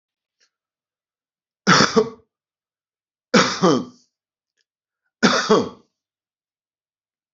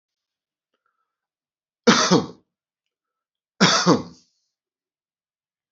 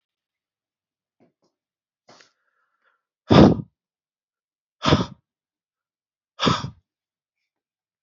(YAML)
three_cough_length: 7.3 s
three_cough_amplitude: 29936
three_cough_signal_mean_std_ratio: 0.3
cough_length: 5.7 s
cough_amplitude: 27644
cough_signal_mean_std_ratio: 0.27
exhalation_length: 8.0 s
exhalation_amplitude: 31952
exhalation_signal_mean_std_ratio: 0.21
survey_phase: alpha (2021-03-01 to 2021-08-12)
age: 45-64
gender: Male
wearing_mask: 'No'
symptom_new_continuous_cough: true
symptom_fatigue: true
symptom_change_to_sense_of_smell_or_taste: true
symptom_onset: 7 days
smoker_status: Current smoker (11 or more cigarettes per day)
respiratory_condition_asthma: false
respiratory_condition_other: false
recruitment_source: Test and Trace
submission_delay: 2 days
covid_test_result: Positive
covid_test_method: RT-qPCR